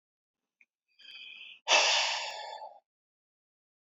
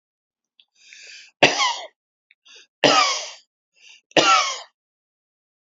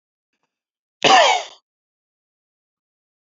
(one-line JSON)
{"exhalation_length": "3.8 s", "exhalation_amplitude": 9738, "exhalation_signal_mean_std_ratio": 0.36, "three_cough_length": "5.6 s", "three_cough_amplitude": 32767, "three_cough_signal_mean_std_ratio": 0.35, "cough_length": "3.2 s", "cough_amplitude": 28739, "cough_signal_mean_std_ratio": 0.27, "survey_phase": "alpha (2021-03-01 to 2021-08-12)", "age": "45-64", "gender": "Male", "wearing_mask": "No", "symptom_fatigue": true, "smoker_status": "Never smoked", "respiratory_condition_asthma": true, "respiratory_condition_other": false, "recruitment_source": "REACT", "submission_delay": "1 day", "covid_test_result": "Negative", "covid_test_method": "RT-qPCR"}